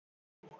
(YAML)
three_cough_length: 0.6 s
three_cough_amplitude: 257
three_cough_signal_mean_std_ratio: 0.42
survey_phase: alpha (2021-03-01 to 2021-08-12)
age: 18-44
gender: Female
wearing_mask: 'No'
symptom_cough_any: true
symptom_new_continuous_cough: true
symptom_shortness_of_breath: true
symptom_abdominal_pain: true
symptom_diarrhoea: true
symptom_fatigue: true
symptom_fever_high_temperature: true
symptom_headache: true
smoker_status: Never smoked
respiratory_condition_asthma: false
respiratory_condition_other: false
recruitment_source: Test and Trace
submission_delay: 2 days
covid_test_result: Positive
covid_test_method: RT-qPCR